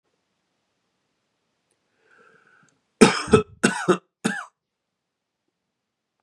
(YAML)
three_cough_length: 6.2 s
three_cough_amplitude: 32768
three_cough_signal_mean_std_ratio: 0.22
survey_phase: beta (2021-08-13 to 2022-03-07)
age: 18-44
gender: Male
wearing_mask: 'No'
symptom_none: true
symptom_onset: 6 days
smoker_status: Prefer not to say
respiratory_condition_asthma: false
respiratory_condition_other: false
recruitment_source: REACT
submission_delay: 16 days
covid_test_result: Negative
covid_test_method: RT-qPCR
influenza_a_test_result: Unknown/Void
influenza_b_test_result: Unknown/Void